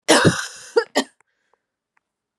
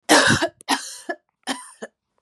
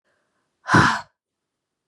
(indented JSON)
{
  "cough_length": "2.4 s",
  "cough_amplitude": 30595,
  "cough_signal_mean_std_ratio": 0.35,
  "three_cough_length": "2.2 s",
  "three_cough_amplitude": 29995,
  "three_cough_signal_mean_std_ratio": 0.43,
  "exhalation_length": "1.9 s",
  "exhalation_amplitude": 25801,
  "exhalation_signal_mean_std_ratio": 0.31,
  "survey_phase": "beta (2021-08-13 to 2022-03-07)",
  "age": "45-64",
  "gender": "Female",
  "wearing_mask": "No",
  "symptom_cough_any": true,
  "symptom_runny_or_blocked_nose": true,
  "symptom_onset": "3 days",
  "smoker_status": "Never smoked",
  "respiratory_condition_asthma": false,
  "respiratory_condition_other": false,
  "recruitment_source": "Test and Trace",
  "submission_delay": "2 days",
  "covid_test_result": "Positive",
  "covid_test_method": "RT-qPCR",
  "covid_ct_value": 14.5,
  "covid_ct_gene": "ORF1ab gene"
}